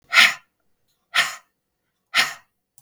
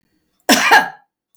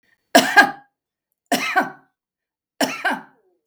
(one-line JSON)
{"exhalation_length": "2.8 s", "exhalation_amplitude": 32768, "exhalation_signal_mean_std_ratio": 0.31, "cough_length": "1.4 s", "cough_amplitude": 32768, "cough_signal_mean_std_ratio": 0.42, "three_cough_length": "3.7 s", "three_cough_amplitude": 32768, "three_cough_signal_mean_std_ratio": 0.34, "survey_phase": "beta (2021-08-13 to 2022-03-07)", "age": "65+", "gender": "Female", "wearing_mask": "No", "symptom_none": true, "smoker_status": "Ex-smoker", "respiratory_condition_asthma": true, "respiratory_condition_other": false, "recruitment_source": "REACT", "submission_delay": "2 days", "covid_test_result": "Negative", "covid_test_method": "RT-qPCR", "influenza_a_test_result": "Negative", "influenza_b_test_result": "Negative"}